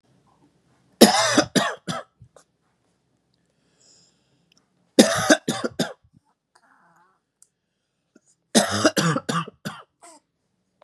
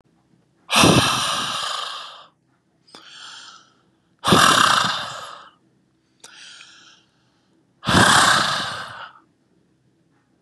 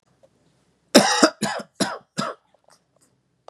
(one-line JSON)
{"three_cough_length": "10.8 s", "three_cough_amplitude": 32768, "three_cough_signal_mean_std_ratio": 0.3, "exhalation_length": "10.4 s", "exhalation_amplitude": 30802, "exhalation_signal_mean_std_ratio": 0.43, "cough_length": "3.5 s", "cough_amplitude": 32768, "cough_signal_mean_std_ratio": 0.31, "survey_phase": "beta (2021-08-13 to 2022-03-07)", "age": "18-44", "gender": "Male", "wearing_mask": "No", "symptom_none": true, "smoker_status": "Never smoked", "respiratory_condition_asthma": false, "respiratory_condition_other": false, "recruitment_source": "REACT", "submission_delay": "1 day", "covid_test_result": "Negative", "covid_test_method": "RT-qPCR"}